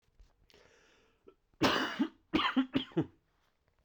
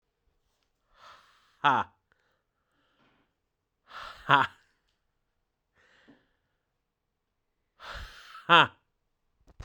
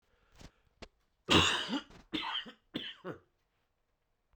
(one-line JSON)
{"cough_length": "3.8 s", "cough_amplitude": 7173, "cough_signal_mean_std_ratio": 0.4, "exhalation_length": "9.6 s", "exhalation_amplitude": 20106, "exhalation_signal_mean_std_ratio": 0.19, "three_cough_length": "4.4 s", "three_cough_amplitude": 7338, "three_cough_signal_mean_std_ratio": 0.34, "survey_phase": "beta (2021-08-13 to 2022-03-07)", "age": "18-44", "gender": "Male", "wearing_mask": "No", "symptom_cough_any": true, "symptom_new_continuous_cough": true, "symptom_runny_or_blocked_nose": true, "symptom_sore_throat": true, "symptom_change_to_sense_of_smell_or_taste": true, "symptom_onset": "4 days", "smoker_status": "Never smoked", "respiratory_condition_asthma": false, "respiratory_condition_other": false, "recruitment_source": "Test and Trace", "submission_delay": "1 day", "covid_test_result": "Positive", "covid_test_method": "ePCR"}